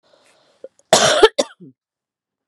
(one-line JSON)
{"cough_length": "2.5 s", "cough_amplitude": 32768, "cough_signal_mean_std_ratio": 0.31, "survey_phase": "beta (2021-08-13 to 2022-03-07)", "age": "45-64", "gender": "Female", "wearing_mask": "No", "symptom_cough_any": true, "symptom_runny_or_blocked_nose": true, "symptom_diarrhoea": true, "symptom_fatigue": true, "symptom_headache": true, "symptom_change_to_sense_of_smell_or_taste": true, "symptom_loss_of_taste": true, "symptom_other": true, "symptom_onset": "3 days", "smoker_status": "Ex-smoker", "respiratory_condition_asthma": false, "respiratory_condition_other": false, "recruitment_source": "Test and Trace", "submission_delay": "1 day", "covid_test_result": "Positive", "covid_test_method": "ePCR"}